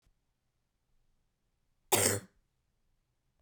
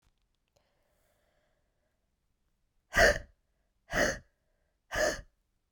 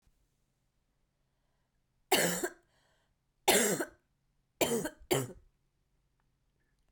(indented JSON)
{
  "cough_length": "3.4 s",
  "cough_amplitude": 9098,
  "cough_signal_mean_std_ratio": 0.22,
  "exhalation_length": "5.7 s",
  "exhalation_amplitude": 10898,
  "exhalation_signal_mean_std_ratio": 0.26,
  "three_cough_length": "6.9 s",
  "three_cough_amplitude": 7789,
  "three_cough_signal_mean_std_ratio": 0.32,
  "survey_phase": "beta (2021-08-13 to 2022-03-07)",
  "age": "18-44",
  "gender": "Female",
  "wearing_mask": "No",
  "symptom_cough_any": true,
  "symptom_runny_or_blocked_nose": true,
  "symptom_diarrhoea": true,
  "symptom_fatigue": true,
  "symptom_headache": true,
  "symptom_change_to_sense_of_smell_or_taste": true,
  "symptom_loss_of_taste": true,
  "symptom_other": true,
  "symptom_onset": "7 days",
  "smoker_status": "Never smoked",
  "respiratory_condition_asthma": true,
  "respiratory_condition_other": false,
  "recruitment_source": "Test and Trace",
  "submission_delay": "5 days",
  "covid_test_result": "Positive",
  "covid_test_method": "RT-qPCR"
}